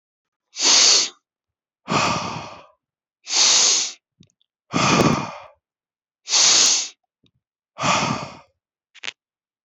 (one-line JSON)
{"exhalation_length": "9.6 s", "exhalation_amplitude": 25789, "exhalation_signal_mean_std_ratio": 0.47, "survey_phase": "beta (2021-08-13 to 2022-03-07)", "age": "18-44", "gender": "Male", "wearing_mask": "Yes", "symptom_none": true, "smoker_status": "Ex-smoker", "respiratory_condition_asthma": false, "respiratory_condition_other": false, "recruitment_source": "REACT", "submission_delay": "1 day", "covid_test_result": "Negative", "covid_test_method": "RT-qPCR"}